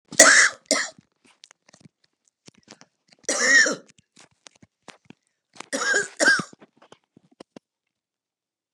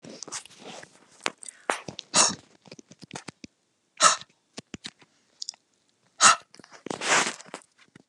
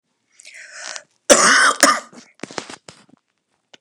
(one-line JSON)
{"three_cough_length": "8.7 s", "three_cough_amplitude": 32768, "three_cough_signal_mean_std_ratio": 0.31, "exhalation_length": "8.1 s", "exhalation_amplitude": 28088, "exhalation_signal_mean_std_ratio": 0.28, "cough_length": "3.8 s", "cough_amplitude": 32768, "cough_signal_mean_std_ratio": 0.35, "survey_phase": "beta (2021-08-13 to 2022-03-07)", "age": "65+", "gender": "Female", "wearing_mask": "No", "symptom_none": true, "smoker_status": "Current smoker (11 or more cigarettes per day)", "respiratory_condition_asthma": false, "respiratory_condition_other": false, "recruitment_source": "REACT", "submission_delay": "2 days", "covid_test_result": "Negative", "covid_test_method": "RT-qPCR", "influenza_a_test_result": "Negative", "influenza_b_test_result": "Negative"}